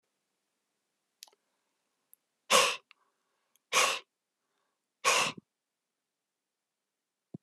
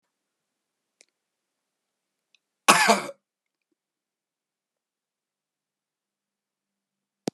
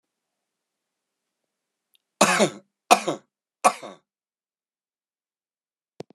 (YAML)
exhalation_length: 7.4 s
exhalation_amplitude: 10927
exhalation_signal_mean_std_ratio: 0.25
cough_length: 7.3 s
cough_amplitude: 31891
cough_signal_mean_std_ratio: 0.16
three_cough_length: 6.1 s
three_cough_amplitude: 32767
three_cough_signal_mean_std_ratio: 0.21
survey_phase: beta (2021-08-13 to 2022-03-07)
age: 65+
gender: Male
wearing_mask: 'No'
symptom_none: true
smoker_status: Current smoker (1 to 10 cigarettes per day)
respiratory_condition_asthma: false
respiratory_condition_other: true
recruitment_source: Test and Trace
submission_delay: 1 day
covid_test_result: Positive
covid_test_method: RT-qPCR
covid_ct_value: 13.5
covid_ct_gene: S gene